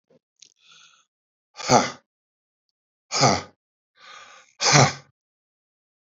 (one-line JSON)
{"exhalation_length": "6.1 s", "exhalation_amplitude": 26216, "exhalation_signal_mean_std_ratio": 0.28, "survey_phase": "beta (2021-08-13 to 2022-03-07)", "age": "65+", "gender": "Male", "wearing_mask": "No", "symptom_cough_any": true, "symptom_runny_or_blocked_nose": true, "symptom_shortness_of_breath": true, "symptom_sore_throat": true, "symptom_headache": true, "symptom_onset": "4 days", "smoker_status": "Ex-smoker", "respiratory_condition_asthma": true, "respiratory_condition_other": false, "recruitment_source": "Test and Trace", "submission_delay": "2 days", "covid_test_result": "Negative", "covid_test_method": "RT-qPCR"}